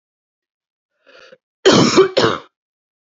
cough_length: 3.2 s
cough_amplitude: 32767
cough_signal_mean_std_ratio: 0.36
survey_phase: beta (2021-08-13 to 2022-03-07)
age: 18-44
gender: Female
wearing_mask: 'No'
symptom_none: true
smoker_status: Never smoked
respiratory_condition_asthma: false
respiratory_condition_other: false
recruitment_source: Test and Trace
submission_delay: 2 days
covid_test_result: Negative
covid_test_method: RT-qPCR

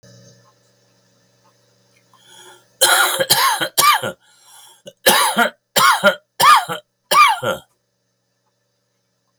cough_length: 9.4 s
cough_amplitude: 32768
cough_signal_mean_std_ratio: 0.42
survey_phase: beta (2021-08-13 to 2022-03-07)
age: 65+
gender: Male
wearing_mask: 'No'
symptom_cough_any: true
symptom_runny_or_blocked_nose: true
symptom_shortness_of_breath: true
symptom_sore_throat: true
symptom_fatigue: true
symptom_other: true
symptom_onset: 5 days
smoker_status: Ex-smoker
respiratory_condition_asthma: true
respiratory_condition_other: false
recruitment_source: Test and Trace
submission_delay: 2 days
covid_test_result: Positive
covid_test_method: RT-qPCR
covid_ct_value: 25.6
covid_ct_gene: N gene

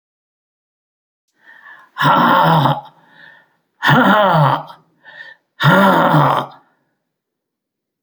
exhalation_length: 8.0 s
exhalation_amplitude: 32768
exhalation_signal_mean_std_ratio: 0.48
survey_phase: beta (2021-08-13 to 2022-03-07)
age: 65+
gender: Male
wearing_mask: 'No'
symptom_cough_any: true
symptom_runny_or_blocked_nose: true
symptom_fatigue: true
symptom_change_to_sense_of_smell_or_taste: true
symptom_onset: 4 days
smoker_status: Never smoked
respiratory_condition_asthma: false
respiratory_condition_other: false
recruitment_source: Test and Trace
submission_delay: 2 days
covid_test_result: Positive
covid_test_method: ePCR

